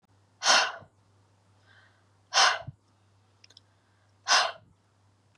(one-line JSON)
{"exhalation_length": "5.4 s", "exhalation_amplitude": 13841, "exhalation_signal_mean_std_ratio": 0.3, "survey_phase": "beta (2021-08-13 to 2022-03-07)", "age": "45-64", "gender": "Female", "wearing_mask": "No", "symptom_runny_or_blocked_nose": true, "symptom_fatigue": true, "symptom_onset": "13 days", "smoker_status": "Never smoked", "respiratory_condition_asthma": false, "respiratory_condition_other": false, "recruitment_source": "REACT", "submission_delay": "2 days", "covid_test_result": "Negative", "covid_test_method": "RT-qPCR", "influenza_a_test_result": "Negative", "influenza_b_test_result": "Negative"}